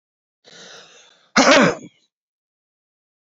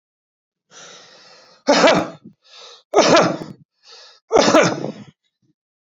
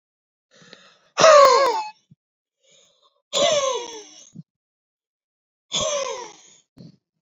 {"cough_length": "3.2 s", "cough_amplitude": 32290, "cough_signal_mean_std_ratio": 0.29, "three_cough_length": "5.8 s", "three_cough_amplitude": 30997, "three_cough_signal_mean_std_ratio": 0.4, "exhalation_length": "7.3 s", "exhalation_amplitude": 27074, "exhalation_signal_mean_std_ratio": 0.35, "survey_phase": "beta (2021-08-13 to 2022-03-07)", "age": "65+", "gender": "Male", "wearing_mask": "No", "symptom_none": true, "symptom_onset": "8 days", "smoker_status": "Ex-smoker", "respiratory_condition_asthma": false, "respiratory_condition_other": false, "recruitment_source": "REACT", "submission_delay": "3 days", "covid_test_result": "Negative", "covid_test_method": "RT-qPCR"}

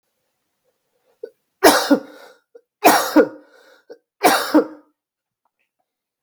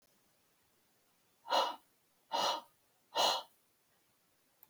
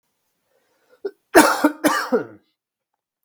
{"three_cough_length": "6.2 s", "three_cough_amplitude": 32768, "three_cough_signal_mean_std_ratio": 0.32, "exhalation_length": "4.7 s", "exhalation_amplitude": 3924, "exhalation_signal_mean_std_ratio": 0.34, "cough_length": "3.2 s", "cough_amplitude": 32766, "cough_signal_mean_std_ratio": 0.33, "survey_phase": "beta (2021-08-13 to 2022-03-07)", "age": "18-44", "gender": "Male", "wearing_mask": "No", "symptom_none": true, "smoker_status": "Never smoked", "respiratory_condition_asthma": false, "respiratory_condition_other": false, "recruitment_source": "REACT", "submission_delay": "1 day", "covid_test_result": "Negative", "covid_test_method": "RT-qPCR", "influenza_a_test_result": "Negative", "influenza_b_test_result": "Negative"}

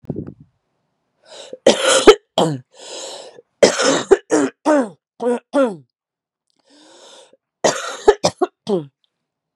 {"three_cough_length": "9.6 s", "three_cough_amplitude": 32768, "three_cough_signal_mean_std_ratio": 0.38, "survey_phase": "beta (2021-08-13 to 2022-03-07)", "age": "18-44", "gender": "Female", "wearing_mask": "No", "symptom_cough_any": true, "symptom_runny_or_blocked_nose": true, "symptom_sore_throat": true, "symptom_diarrhoea": true, "symptom_fatigue": true, "symptom_headache": true, "symptom_other": true, "symptom_onset": "2 days", "smoker_status": "Ex-smoker", "respiratory_condition_asthma": false, "respiratory_condition_other": false, "recruitment_source": "Test and Trace", "submission_delay": "2 days", "covid_test_result": "Positive", "covid_test_method": "RT-qPCR", "covid_ct_value": 25.0, "covid_ct_gene": "N gene"}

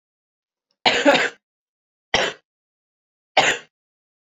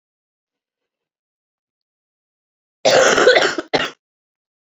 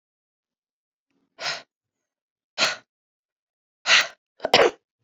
{"three_cough_length": "4.3 s", "three_cough_amplitude": 28159, "three_cough_signal_mean_std_ratio": 0.33, "cough_length": "4.8 s", "cough_amplitude": 30355, "cough_signal_mean_std_ratio": 0.33, "exhalation_length": "5.0 s", "exhalation_amplitude": 26854, "exhalation_signal_mean_std_ratio": 0.26, "survey_phase": "alpha (2021-03-01 to 2021-08-12)", "age": "18-44", "gender": "Female", "wearing_mask": "No", "symptom_cough_any": true, "symptom_new_continuous_cough": true, "symptom_fatigue": true, "symptom_fever_high_temperature": true, "symptom_headache": true, "symptom_onset": "2 days", "smoker_status": "Never smoked", "respiratory_condition_asthma": false, "respiratory_condition_other": false, "recruitment_source": "Test and Trace", "submission_delay": "1 day", "covid_test_result": "Positive", "covid_test_method": "RT-qPCR", "covid_ct_value": 17.5, "covid_ct_gene": "ORF1ab gene", "covid_ct_mean": 17.7, "covid_viral_load": "1600000 copies/ml", "covid_viral_load_category": "High viral load (>1M copies/ml)"}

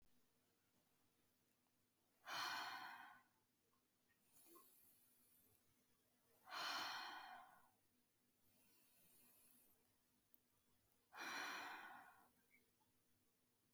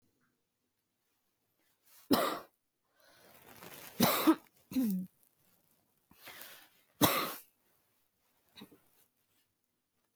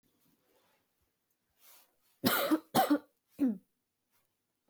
{"exhalation_length": "13.7 s", "exhalation_amplitude": 526, "exhalation_signal_mean_std_ratio": 0.42, "three_cough_length": "10.2 s", "three_cough_amplitude": 10079, "three_cough_signal_mean_std_ratio": 0.29, "cough_length": "4.7 s", "cough_amplitude": 7388, "cough_signal_mean_std_ratio": 0.32, "survey_phase": "beta (2021-08-13 to 2022-03-07)", "age": "18-44", "gender": "Female", "wearing_mask": "No", "symptom_cough_any": true, "symptom_runny_or_blocked_nose": true, "symptom_sore_throat": true, "symptom_diarrhoea": true, "symptom_fatigue": true, "symptom_other": true, "smoker_status": "Ex-smoker", "respiratory_condition_asthma": false, "respiratory_condition_other": false, "recruitment_source": "Test and Trace", "submission_delay": "1 day", "covid_test_result": "Positive", "covid_test_method": "RT-qPCR", "covid_ct_value": 14.8, "covid_ct_gene": "ORF1ab gene"}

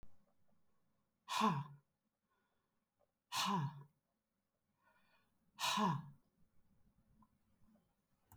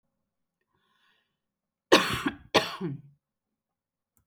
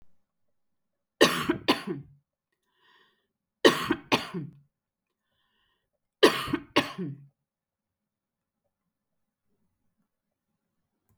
{"exhalation_length": "8.4 s", "exhalation_amplitude": 2411, "exhalation_signal_mean_std_ratio": 0.34, "cough_length": "4.3 s", "cough_amplitude": 20290, "cough_signal_mean_std_ratio": 0.25, "three_cough_length": "11.2 s", "three_cough_amplitude": 21798, "three_cough_signal_mean_std_ratio": 0.24, "survey_phase": "beta (2021-08-13 to 2022-03-07)", "age": "45-64", "gender": "Female", "wearing_mask": "No", "symptom_abdominal_pain": true, "symptom_onset": "12 days", "smoker_status": "Never smoked", "respiratory_condition_asthma": false, "respiratory_condition_other": false, "recruitment_source": "REACT", "submission_delay": "2 days", "covid_test_result": "Negative", "covid_test_method": "RT-qPCR", "influenza_a_test_result": "Negative", "influenza_b_test_result": "Negative"}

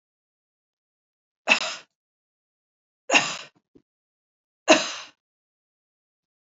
{"three_cough_length": "6.5 s", "three_cough_amplitude": 28320, "three_cough_signal_mean_std_ratio": 0.22, "survey_phase": "beta (2021-08-13 to 2022-03-07)", "age": "45-64", "gender": "Female", "wearing_mask": "No", "symptom_cough_any": true, "symptom_runny_or_blocked_nose": true, "symptom_sore_throat": true, "symptom_fatigue": true, "symptom_other": true, "smoker_status": "Never smoked", "respiratory_condition_asthma": false, "respiratory_condition_other": false, "recruitment_source": "Test and Trace", "submission_delay": "2 days", "covid_test_result": "Positive", "covid_test_method": "ePCR"}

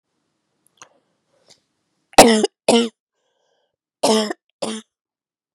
{"cough_length": "5.5 s", "cough_amplitude": 32768, "cough_signal_mean_std_ratio": 0.27, "survey_phase": "beta (2021-08-13 to 2022-03-07)", "age": "18-44", "gender": "Female", "wearing_mask": "No", "symptom_cough_any": true, "symptom_runny_or_blocked_nose": true, "symptom_sore_throat": true, "symptom_abdominal_pain": true, "symptom_diarrhoea": true, "symptom_fatigue": true, "symptom_fever_high_temperature": true, "smoker_status": "Ex-smoker", "respiratory_condition_asthma": false, "respiratory_condition_other": false, "recruitment_source": "Test and Trace", "submission_delay": "2 days", "covid_test_result": "Positive", "covid_test_method": "LFT"}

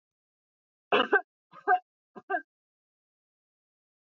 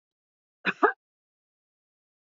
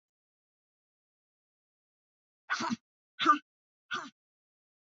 {"three_cough_length": "4.0 s", "three_cough_amplitude": 10310, "three_cough_signal_mean_std_ratio": 0.25, "cough_length": "2.3 s", "cough_amplitude": 17387, "cough_signal_mean_std_ratio": 0.18, "exhalation_length": "4.9 s", "exhalation_amplitude": 7606, "exhalation_signal_mean_std_ratio": 0.22, "survey_phase": "beta (2021-08-13 to 2022-03-07)", "age": "65+", "gender": "Female", "wearing_mask": "No", "symptom_none": true, "smoker_status": "Never smoked", "respiratory_condition_asthma": false, "respiratory_condition_other": false, "recruitment_source": "REACT", "submission_delay": "1 day", "covid_test_result": "Negative", "covid_test_method": "RT-qPCR"}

